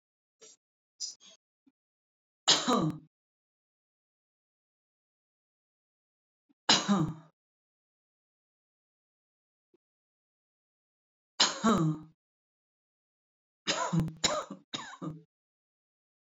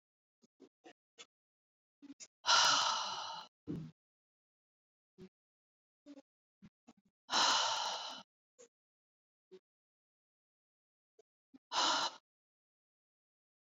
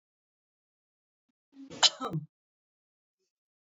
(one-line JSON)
{"three_cough_length": "16.2 s", "three_cough_amplitude": 12968, "three_cough_signal_mean_std_ratio": 0.28, "exhalation_length": "13.7 s", "exhalation_amplitude": 5231, "exhalation_signal_mean_std_ratio": 0.31, "cough_length": "3.7 s", "cough_amplitude": 15064, "cough_signal_mean_std_ratio": 0.18, "survey_phase": "beta (2021-08-13 to 2022-03-07)", "age": "45-64", "gender": "Female", "wearing_mask": "No", "symptom_none": true, "symptom_onset": "12 days", "smoker_status": "Never smoked", "respiratory_condition_asthma": true, "respiratory_condition_other": false, "recruitment_source": "REACT", "submission_delay": "12 days", "covid_test_result": "Negative", "covid_test_method": "RT-qPCR"}